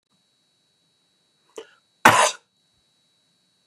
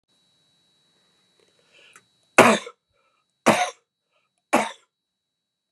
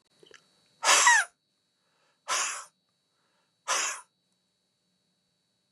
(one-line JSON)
{"cough_length": "3.7 s", "cough_amplitude": 32768, "cough_signal_mean_std_ratio": 0.2, "three_cough_length": "5.7 s", "three_cough_amplitude": 32767, "three_cough_signal_mean_std_ratio": 0.23, "exhalation_length": "5.7 s", "exhalation_amplitude": 14530, "exhalation_signal_mean_std_ratio": 0.3, "survey_phase": "beta (2021-08-13 to 2022-03-07)", "age": "65+", "gender": "Male", "wearing_mask": "No", "symptom_none": true, "smoker_status": "Ex-smoker", "respiratory_condition_asthma": false, "respiratory_condition_other": false, "recruitment_source": "REACT", "submission_delay": "3 days", "covid_test_result": "Negative", "covid_test_method": "RT-qPCR", "influenza_a_test_result": "Unknown/Void", "influenza_b_test_result": "Unknown/Void"}